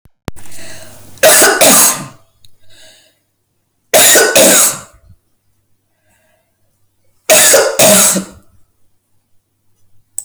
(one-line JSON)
{"three_cough_length": "10.2 s", "three_cough_amplitude": 32768, "three_cough_signal_mean_std_ratio": 0.47, "survey_phase": "alpha (2021-03-01 to 2021-08-12)", "age": "65+", "gender": "Female", "wearing_mask": "No", "symptom_none": true, "smoker_status": "Never smoked", "respiratory_condition_asthma": false, "respiratory_condition_other": false, "recruitment_source": "REACT", "submission_delay": "2 days", "covid_test_result": "Negative", "covid_test_method": "RT-qPCR"}